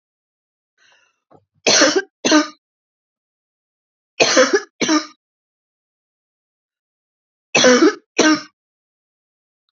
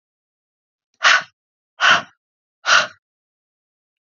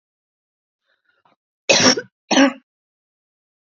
{"three_cough_length": "9.7 s", "three_cough_amplitude": 29947, "three_cough_signal_mean_std_ratio": 0.34, "exhalation_length": "4.0 s", "exhalation_amplitude": 30800, "exhalation_signal_mean_std_ratio": 0.3, "cough_length": "3.8 s", "cough_amplitude": 32520, "cough_signal_mean_std_ratio": 0.29, "survey_phase": "beta (2021-08-13 to 2022-03-07)", "age": "18-44", "gender": "Female", "wearing_mask": "No", "symptom_fever_high_temperature": true, "symptom_headache": true, "symptom_onset": "1 day", "smoker_status": "Never smoked", "respiratory_condition_asthma": false, "respiratory_condition_other": false, "recruitment_source": "Test and Trace", "submission_delay": "1 day", "covid_test_result": "Negative", "covid_test_method": "RT-qPCR"}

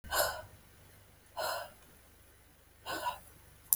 {"exhalation_length": "3.8 s", "exhalation_amplitude": 20040, "exhalation_signal_mean_std_ratio": 0.41, "survey_phase": "alpha (2021-03-01 to 2021-08-12)", "age": "18-44", "gender": "Female", "wearing_mask": "No", "symptom_none": true, "smoker_status": "Never smoked", "respiratory_condition_asthma": false, "respiratory_condition_other": false, "recruitment_source": "REACT", "submission_delay": "2 days", "covid_test_result": "Negative", "covid_test_method": "RT-qPCR"}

